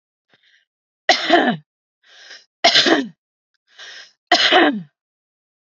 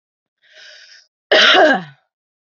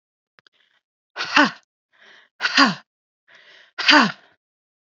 {
  "three_cough_length": "5.6 s",
  "three_cough_amplitude": 32768,
  "three_cough_signal_mean_std_ratio": 0.39,
  "cough_length": "2.6 s",
  "cough_amplitude": 29983,
  "cough_signal_mean_std_ratio": 0.38,
  "exhalation_length": "4.9 s",
  "exhalation_amplitude": 32768,
  "exhalation_signal_mean_std_ratio": 0.3,
  "survey_phase": "beta (2021-08-13 to 2022-03-07)",
  "age": "18-44",
  "gender": "Female",
  "wearing_mask": "No",
  "symptom_runny_or_blocked_nose": true,
  "symptom_fatigue": true,
  "symptom_headache": true,
  "smoker_status": "Ex-smoker",
  "respiratory_condition_asthma": false,
  "respiratory_condition_other": false,
  "recruitment_source": "Test and Trace",
  "submission_delay": "3 days",
  "covid_test_result": "Negative",
  "covid_test_method": "RT-qPCR"
}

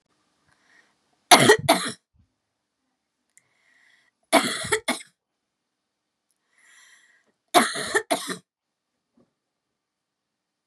{
  "three_cough_length": "10.7 s",
  "three_cough_amplitude": 32768,
  "three_cough_signal_mean_std_ratio": 0.25,
  "survey_phase": "beta (2021-08-13 to 2022-03-07)",
  "age": "18-44",
  "gender": "Female",
  "wearing_mask": "No",
  "symptom_none": true,
  "smoker_status": "Never smoked",
  "respiratory_condition_asthma": false,
  "respiratory_condition_other": false,
  "recruitment_source": "REACT",
  "submission_delay": "2 days",
  "covid_test_result": "Negative",
  "covid_test_method": "RT-qPCR"
}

